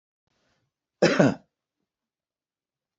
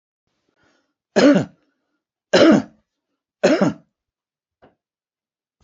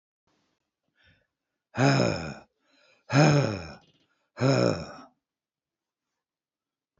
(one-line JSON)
{"cough_length": "3.0 s", "cough_amplitude": 24744, "cough_signal_mean_std_ratio": 0.24, "three_cough_length": "5.6 s", "three_cough_amplitude": 27455, "three_cough_signal_mean_std_ratio": 0.31, "exhalation_length": "7.0 s", "exhalation_amplitude": 13508, "exhalation_signal_mean_std_ratio": 0.35, "survey_phase": "beta (2021-08-13 to 2022-03-07)", "age": "65+", "gender": "Male", "wearing_mask": "No", "symptom_none": true, "symptom_onset": "4 days", "smoker_status": "Ex-smoker", "respiratory_condition_asthma": false, "respiratory_condition_other": false, "recruitment_source": "REACT", "submission_delay": "0 days", "covid_test_result": "Negative", "covid_test_method": "RT-qPCR"}